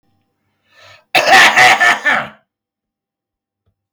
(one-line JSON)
{"cough_length": "3.9 s", "cough_amplitude": 32768, "cough_signal_mean_std_ratio": 0.43, "survey_phase": "beta (2021-08-13 to 2022-03-07)", "age": "45-64", "gender": "Male", "wearing_mask": "No", "symptom_cough_any": true, "symptom_runny_or_blocked_nose": true, "smoker_status": "Ex-smoker", "respiratory_condition_asthma": false, "respiratory_condition_other": false, "recruitment_source": "REACT", "submission_delay": "2 days", "covid_test_result": "Negative", "covid_test_method": "RT-qPCR"}